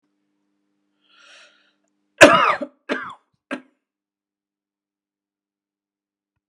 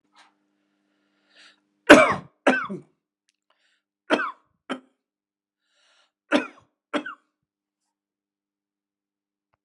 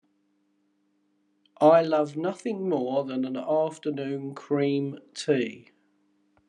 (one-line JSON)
{"cough_length": "6.5 s", "cough_amplitude": 32768, "cough_signal_mean_std_ratio": 0.19, "three_cough_length": "9.6 s", "three_cough_amplitude": 32768, "three_cough_signal_mean_std_ratio": 0.19, "exhalation_length": "6.5 s", "exhalation_amplitude": 15731, "exhalation_signal_mean_std_ratio": 0.54, "survey_phase": "beta (2021-08-13 to 2022-03-07)", "age": "65+", "gender": "Male", "wearing_mask": "No", "symptom_none": true, "smoker_status": "Ex-smoker", "respiratory_condition_asthma": false, "respiratory_condition_other": false, "recruitment_source": "REACT", "submission_delay": "1 day", "covid_test_result": "Negative", "covid_test_method": "RT-qPCR", "influenza_a_test_result": "Negative", "influenza_b_test_result": "Negative"}